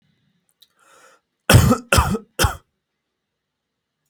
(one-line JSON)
{"three_cough_length": "4.1 s", "three_cough_amplitude": 32768, "three_cough_signal_mean_std_ratio": 0.3, "survey_phase": "beta (2021-08-13 to 2022-03-07)", "age": "18-44", "gender": "Male", "wearing_mask": "No", "symptom_none": true, "smoker_status": "Never smoked", "respiratory_condition_asthma": false, "respiratory_condition_other": false, "recruitment_source": "REACT", "submission_delay": "1 day", "covid_test_result": "Negative", "covid_test_method": "RT-qPCR", "influenza_a_test_result": "Negative", "influenza_b_test_result": "Negative"}